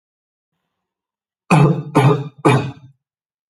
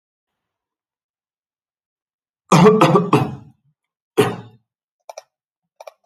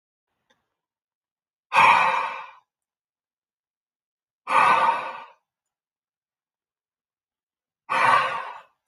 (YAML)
three_cough_length: 3.5 s
three_cough_amplitude: 32767
three_cough_signal_mean_std_ratio: 0.4
cough_length: 6.1 s
cough_amplitude: 28394
cough_signal_mean_std_ratio: 0.3
exhalation_length: 8.9 s
exhalation_amplitude: 21413
exhalation_signal_mean_std_ratio: 0.35
survey_phase: alpha (2021-03-01 to 2021-08-12)
age: 18-44
gender: Male
wearing_mask: 'No'
symptom_none: true
smoker_status: Never smoked
respiratory_condition_asthma: false
respiratory_condition_other: false
recruitment_source: REACT
submission_delay: 1 day
covid_test_result: Negative
covid_test_method: RT-qPCR